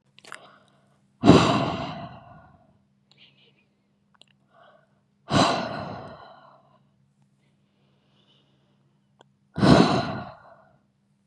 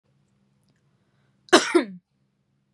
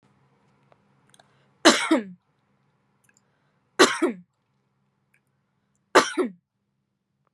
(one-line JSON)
{"exhalation_length": "11.3 s", "exhalation_amplitude": 32172, "exhalation_signal_mean_std_ratio": 0.29, "cough_length": "2.7 s", "cough_amplitude": 31506, "cough_signal_mean_std_ratio": 0.23, "three_cough_length": "7.3 s", "three_cough_amplitude": 31499, "three_cough_signal_mean_std_ratio": 0.24, "survey_phase": "beta (2021-08-13 to 2022-03-07)", "age": "18-44", "gender": "Female", "wearing_mask": "No", "symptom_none": true, "smoker_status": "Never smoked", "respiratory_condition_asthma": false, "respiratory_condition_other": false, "recruitment_source": "REACT", "submission_delay": "2 days", "covid_test_result": "Negative", "covid_test_method": "RT-qPCR"}